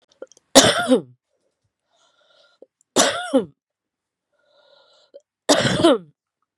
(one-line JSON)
{"three_cough_length": "6.6 s", "three_cough_amplitude": 32768, "three_cough_signal_mean_std_ratio": 0.33, "survey_phase": "beta (2021-08-13 to 2022-03-07)", "age": "45-64", "gender": "Female", "wearing_mask": "No", "symptom_cough_any": true, "symptom_runny_or_blocked_nose": true, "symptom_diarrhoea": true, "symptom_fatigue": true, "symptom_headache": true, "symptom_change_to_sense_of_smell_or_taste": true, "symptom_loss_of_taste": true, "symptom_other": true, "symptom_onset": "3 days", "smoker_status": "Ex-smoker", "respiratory_condition_asthma": false, "respiratory_condition_other": false, "recruitment_source": "Test and Trace", "submission_delay": "1 day", "covid_test_result": "Positive", "covid_test_method": "ePCR"}